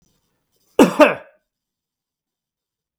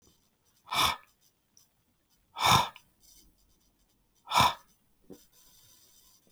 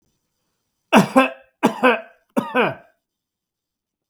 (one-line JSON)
{"cough_length": "3.0 s", "cough_amplitude": 32768, "cough_signal_mean_std_ratio": 0.23, "exhalation_length": "6.3 s", "exhalation_amplitude": 12047, "exhalation_signal_mean_std_ratio": 0.28, "three_cough_length": "4.1 s", "three_cough_amplitude": 32766, "three_cough_signal_mean_std_ratio": 0.34, "survey_phase": "beta (2021-08-13 to 2022-03-07)", "age": "45-64", "gender": "Male", "wearing_mask": "No", "symptom_none": true, "smoker_status": "Ex-smoker", "respiratory_condition_asthma": false, "respiratory_condition_other": false, "recruitment_source": "REACT", "submission_delay": "1 day", "covid_test_result": "Negative", "covid_test_method": "RT-qPCR"}